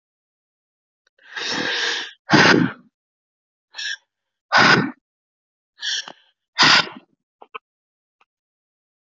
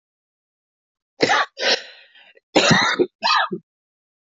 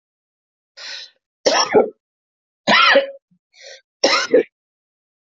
{
  "exhalation_length": "9.0 s",
  "exhalation_amplitude": 31556,
  "exhalation_signal_mean_std_ratio": 0.34,
  "cough_length": "4.4 s",
  "cough_amplitude": 28843,
  "cough_signal_mean_std_ratio": 0.43,
  "three_cough_length": "5.3 s",
  "three_cough_amplitude": 28719,
  "three_cough_signal_mean_std_ratio": 0.38,
  "survey_phase": "beta (2021-08-13 to 2022-03-07)",
  "age": "45-64",
  "gender": "Female",
  "wearing_mask": "No",
  "symptom_cough_any": true,
  "symptom_runny_or_blocked_nose": true,
  "symptom_shortness_of_breath": true,
  "symptom_fatigue": true,
  "symptom_headache": true,
  "symptom_change_to_sense_of_smell_or_taste": true,
  "symptom_loss_of_taste": true,
  "symptom_other": true,
  "symptom_onset": "4 days",
  "smoker_status": "Ex-smoker",
  "respiratory_condition_asthma": false,
  "respiratory_condition_other": false,
  "recruitment_source": "Test and Trace",
  "submission_delay": "2 days",
  "covid_test_result": "Positive",
  "covid_test_method": "RT-qPCR",
  "covid_ct_value": 15.1,
  "covid_ct_gene": "ORF1ab gene",
  "covid_ct_mean": 15.4,
  "covid_viral_load": "9100000 copies/ml",
  "covid_viral_load_category": "High viral load (>1M copies/ml)"
}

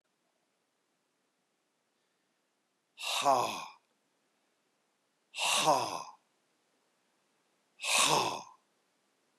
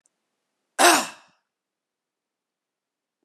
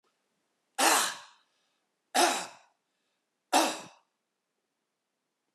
{
  "exhalation_length": "9.4 s",
  "exhalation_amplitude": 7974,
  "exhalation_signal_mean_std_ratio": 0.33,
  "cough_length": "3.2 s",
  "cough_amplitude": 28648,
  "cough_signal_mean_std_ratio": 0.21,
  "three_cough_length": "5.5 s",
  "three_cough_amplitude": 9982,
  "three_cough_signal_mean_std_ratio": 0.31,
  "survey_phase": "beta (2021-08-13 to 2022-03-07)",
  "age": "65+",
  "gender": "Male",
  "wearing_mask": "No",
  "symptom_none": true,
  "smoker_status": "Ex-smoker",
  "respiratory_condition_asthma": false,
  "respiratory_condition_other": false,
  "recruitment_source": "REACT",
  "submission_delay": "1 day",
  "covid_test_result": "Negative",
  "covid_test_method": "RT-qPCR"
}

